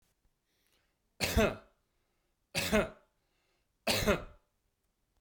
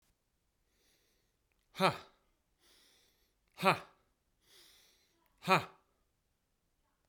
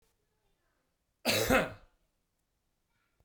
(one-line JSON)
{"three_cough_length": "5.2 s", "three_cough_amplitude": 7619, "three_cough_signal_mean_std_ratio": 0.34, "exhalation_length": "7.1 s", "exhalation_amplitude": 8901, "exhalation_signal_mean_std_ratio": 0.2, "cough_length": "3.2 s", "cough_amplitude": 7666, "cough_signal_mean_std_ratio": 0.29, "survey_phase": "beta (2021-08-13 to 2022-03-07)", "age": "18-44", "gender": "Male", "wearing_mask": "No", "symptom_none": true, "smoker_status": "Never smoked", "respiratory_condition_asthma": false, "respiratory_condition_other": false, "recruitment_source": "REACT", "submission_delay": "1 day", "covid_test_result": "Negative", "covid_test_method": "RT-qPCR"}